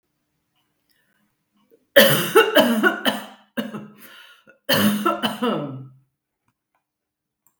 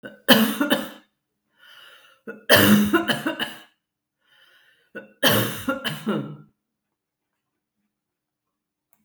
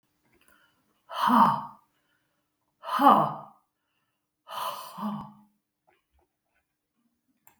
{"cough_length": "7.6 s", "cough_amplitude": 32768, "cough_signal_mean_std_ratio": 0.4, "three_cough_length": "9.0 s", "three_cough_amplitude": 32768, "three_cough_signal_mean_std_ratio": 0.37, "exhalation_length": "7.6 s", "exhalation_amplitude": 18242, "exhalation_signal_mean_std_ratio": 0.3, "survey_phase": "beta (2021-08-13 to 2022-03-07)", "age": "65+", "gender": "Female", "wearing_mask": "No", "symptom_none": true, "smoker_status": "Ex-smoker", "respiratory_condition_asthma": false, "respiratory_condition_other": false, "recruitment_source": "REACT", "submission_delay": "3 days", "covid_test_result": "Negative", "covid_test_method": "RT-qPCR", "influenza_a_test_result": "Negative", "influenza_b_test_result": "Negative"}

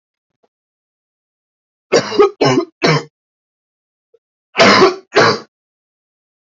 {"cough_length": "6.6 s", "cough_amplitude": 32767, "cough_signal_mean_std_ratio": 0.36, "survey_phase": "alpha (2021-03-01 to 2021-08-12)", "age": "18-44", "gender": "Male", "wearing_mask": "No", "symptom_cough_any": true, "symptom_headache": true, "symptom_onset": "2 days", "smoker_status": "Ex-smoker", "recruitment_source": "Test and Trace", "submission_delay": "1 day", "covid_test_result": "Positive", "covid_test_method": "RT-qPCR", "covid_ct_value": 15.2, "covid_ct_gene": "ORF1ab gene", "covid_ct_mean": 15.2, "covid_viral_load": "10000000 copies/ml", "covid_viral_load_category": "High viral load (>1M copies/ml)"}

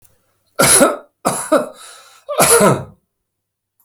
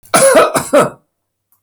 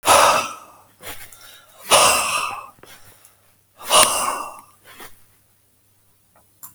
{"three_cough_length": "3.8 s", "three_cough_amplitude": 32768, "three_cough_signal_mean_std_ratio": 0.46, "cough_length": "1.6 s", "cough_amplitude": 32768, "cough_signal_mean_std_ratio": 0.57, "exhalation_length": "6.7 s", "exhalation_amplitude": 32768, "exhalation_signal_mean_std_ratio": 0.4, "survey_phase": "alpha (2021-03-01 to 2021-08-12)", "age": "65+", "gender": "Male", "wearing_mask": "No", "symptom_none": true, "smoker_status": "Never smoked", "respiratory_condition_asthma": false, "respiratory_condition_other": false, "recruitment_source": "REACT", "submission_delay": "1 day", "covid_test_result": "Negative", "covid_test_method": "RT-qPCR"}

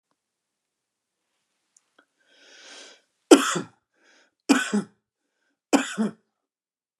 {"three_cough_length": "7.0 s", "three_cough_amplitude": 32390, "three_cough_signal_mean_std_ratio": 0.22, "survey_phase": "beta (2021-08-13 to 2022-03-07)", "age": "45-64", "gender": "Male", "wearing_mask": "No", "symptom_none": true, "smoker_status": "Never smoked", "respiratory_condition_asthma": false, "respiratory_condition_other": false, "recruitment_source": "REACT", "submission_delay": "1 day", "covid_test_result": "Negative", "covid_test_method": "RT-qPCR", "influenza_a_test_result": "Negative", "influenza_b_test_result": "Negative"}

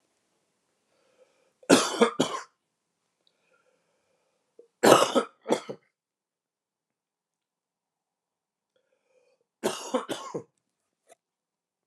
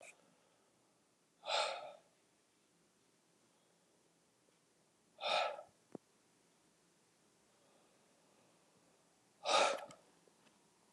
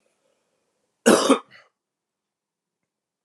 {"three_cough_length": "11.9 s", "three_cough_amplitude": 28458, "three_cough_signal_mean_std_ratio": 0.23, "exhalation_length": "10.9 s", "exhalation_amplitude": 4051, "exhalation_signal_mean_std_ratio": 0.27, "cough_length": "3.2 s", "cough_amplitude": 28319, "cough_signal_mean_std_ratio": 0.23, "survey_phase": "alpha (2021-03-01 to 2021-08-12)", "age": "45-64", "gender": "Male", "wearing_mask": "No", "symptom_abdominal_pain": true, "symptom_fatigue": true, "symptom_headache": true, "smoker_status": "Never smoked", "respiratory_condition_asthma": false, "respiratory_condition_other": false, "recruitment_source": "Test and Trace", "submission_delay": "2 days", "covid_test_result": "Positive", "covid_test_method": "RT-qPCR", "covid_ct_value": 13.9, "covid_ct_gene": "ORF1ab gene", "covid_ct_mean": 14.1, "covid_viral_load": "24000000 copies/ml", "covid_viral_load_category": "High viral load (>1M copies/ml)"}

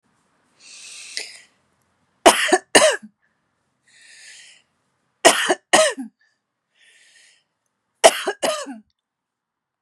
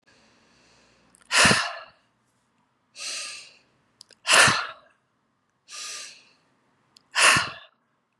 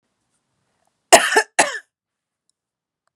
{"three_cough_length": "9.8 s", "three_cough_amplitude": 32768, "three_cough_signal_mean_std_ratio": 0.28, "exhalation_length": "8.2 s", "exhalation_amplitude": 22768, "exhalation_signal_mean_std_ratio": 0.32, "cough_length": "3.2 s", "cough_amplitude": 32768, "cough_signal_mean_std_ratio": 0.24, "survey_phase": "beta (2021-08-13 to 2022-03-07)", "age": "45-64", "gender": "Female", "wearing_mask": "No", "symptom_shortness_of_breath": true, "symptom_fatigue": true, "symptom_headache": true, "symptom_onset": "6 days", "smoker_status": "Ex-smoker", "respiratory_condition_asthma": true, "respiratory_condition_other": false, "recruitment_source": "REACT", "submission_delay": "2 days", "covid_test_result": "Negative", "covid_test_method": "RT-qPCR", "influenza_a_test_result": "Negative", "influenza_b_test_result": "Negative"}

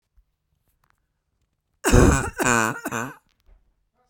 {"cough_length": "4.1 s", "cough_amplitude": 28964, "cough_signal_mean_std_ratio": 0.34, "survey_phase": "beta (2021-08-13 to 2022-03-07)", "age": "18-44", "gender": "Female", "wearing_mask": "No", "symptom_shortness_of_breath": true, "symptom_fatigue": true, "smoker_status": "Ex-smoker", "respiratory_condition_asthma": false, "respiratory_condition_other": false, "recruitment_source": "REACT", "submission_delay": "3 days", "covid_test_result": "Negative", "covid_test_method": "RT-qPCR", "influenza_a_test_result": "Negative", "influenza_b_test_result": "Negative"}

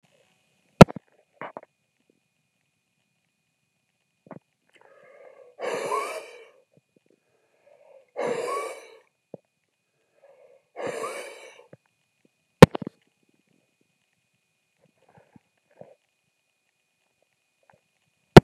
{"exhalation_length": "18.4 s", "exhalation_amplitude": 32768, "exhalation_signal_mean_std_ratio": 0.11, "survey_phase": "beta (2021-08-13 to 2022-03-07)", "age": "65+", "gender": "Male", "wearing_mask": "No", "symptom_cough_any": true, "symptom_runny_or_blocked_nose": true, "symptom_diarrhoea": true, "symptom_fatigue": true, "symptom_change_to_sense_of_smell_or_taste": true, "symptom_onset": "1 day", "smoker_status": "Ex-smoker", "respiratory_condition_asthma": false, "respiratory_condition_other": false, "recruitment_source": "Test and Trace", "submission_delay": "-1 day", "covid_test_result": "Positive", "covid_test_method": "RT-qPCR", "covid_ct_value": 11.2, "covid_ct_gene": "N gene", "covid_ct_mean": 11.8, "covid_viral_load": "130000000 copies/ml", "covid_viral_load_category": "High viral load (>1M copies/ml)"}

